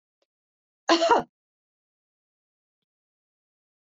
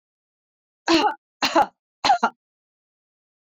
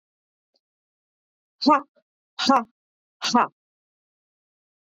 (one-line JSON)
{"cough_length": "3.9 s", "cough_amplitude": 15185, "cough_signal_mean_std_ratio": 0.22, "three_cough_length": "3.6 s", "three_cough_amplitude": 16599, "three_cough_signal_mean_std_ratio": 0.34, "exhalation_length": "4.9 s", "exhalation_amplitude": 18043, "exhalation_signal_mean_std_ratio": 0.26, "survey_phase": "beta (2021-08-13 to 2022-03-07)", "age": "45-64", "gender": "Female", "wearing_mask": "No", "symptom_headache": true, "symptom_loss_of_taste": true, "smoker_status": "Never smoked", "respiratory_condition_asthma": false, "respiratory_condition_other": false, "recruitment_source": "Test and Trace", "submission_delay": "2 days", "covid_test_result": "Positive", "covid_test_method": "RT-qPCR", "covid_ct_value": 15.6, "covid_ct_gene": "ORF1ab gene", "covid_ct_mean": 15.7, "covid_viral_load": "7000000 copies/ml", "covid_viral_load_category": "High viral load (>1M copies/ml)"}